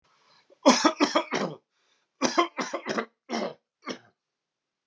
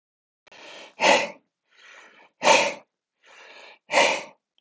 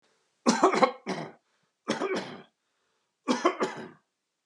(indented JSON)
{
  "cough_length": "4.9 s",
  "cough_amplitude": 20751,
  "cough_signal_mean_std_ratio": 0.38,
  "exhalation_length": "4.6 s",
  "exhalation_amplitude": 20040,
  "exhalation_signal_mean_std_ratio": 0.35,
  "three_cough_length": "4.5 s",
  "three_cough_amplitude": 18765,
  "three_cough_signal_mean_std_ratio": 0.4,
  "survey_phase": "alpha (2021-03-01 to 2021-08-12)",
  "age": "18-44",
  "gender": "Male",
  "wearing_mask": "No",
  "symptom_none": true,
  "smoker_status": "Never smoked",
  "respiratory_condition_asthma": false,
  "respiratory_condition_other": false,
  "recruitment_source": "REACT",
  "submission_delay": "1 day",
  "covid_test_result": "Negative",
  "covid_test_method": "RT-qPCR"
}